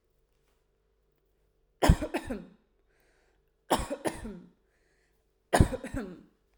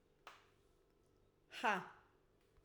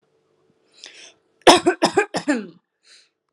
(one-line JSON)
{"three_cough_length": "6.6 s", "three_cough_amplitude": 16521, "three_cough_signal_mean_std_ratio": 0.27, "exhalation_length": "2.6 s", "exhalation_amplitude": 2230, "exhalation_signal_mean_std_ratio": 0.28, "cough_length": "3.3 s", "cough_amplitude": 32768, "cough_signal_mean_std_ratio": 0.3, "survey_phase": "alpha (2021-03-01 to 2021-08-12)", "age": "18-44", "gender": "Female", "wearing_mask": "No", "symptom_none": true, "smoker_status": "Never smoked", "respiratory_condition_asthma": false, "respiratory_condition_other": false, "recruitment_source": "REACT", "submission_delay": "1 day", "covid_test_result": "Negative", "covid_test_method": "RT-qPCR"}